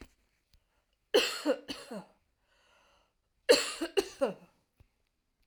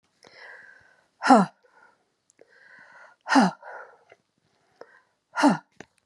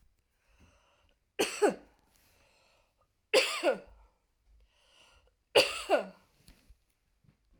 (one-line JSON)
{"cough_length": "5.5 s", "cough_amplitude": 11135, "cough_signal_mean_std_ratio": 0.3, "exhalation_length": "6.1 s", "exhalation_amplitude": 26116, "exhalation_signal_mean_std_ratio": 0.26, "three_cough_length": "7.6 s", "three_cough_amplitude": 14493, "three_cough_signal_mean_std_ratio": 0.28, "survey_phase": "alpha (2021-03-01 to 2021-08-12)", "age": "45-64", "gender": "Female", "wearing_mask": "No", "symptom_none": true, "smoker_status": "Never smoked", "respiratory_condition_asthma": false, "respiratory_condition_other": false, "recruitment_source": "REACT", "submission_delay": "2 days", "covid_test_result": "Negative", "covid_test_method": "RT-qPCR"}